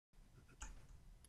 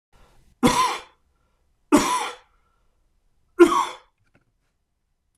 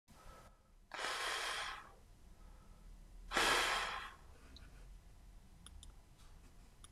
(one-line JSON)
{"cough_length": "1.3 s", "cough_amplitude": 461, "cough_signal_mean_std_ratio": 0.82, "three_cough_length": "5.4 s", "three_cough_amplitude": 26027, "three_cough_signal_mean_std_ratio": 0.31, "exhalation_length": "6.9 s", "exhalation_amplitude": 4000, "exhalation_signal_mean_std_ratio": 0.51, "survey_phase": "beta (2021-08-13 to 2022-03-07)", "age": "65+", "gender": "Male", "wearing_mask": "No", "symptom_none": true, "smoker_status": "Never smoked", "respiratory_condition_asthma": false, "respiratory_condition_other": false, "recruitment_source": "REACT", "submission_delay": "2 days", "covid_test_result": "Negative", "covid_test_method": "RT-qPCR", "influenza_a_test_result": "Negative", "influenza_b_test_result": "Negative"}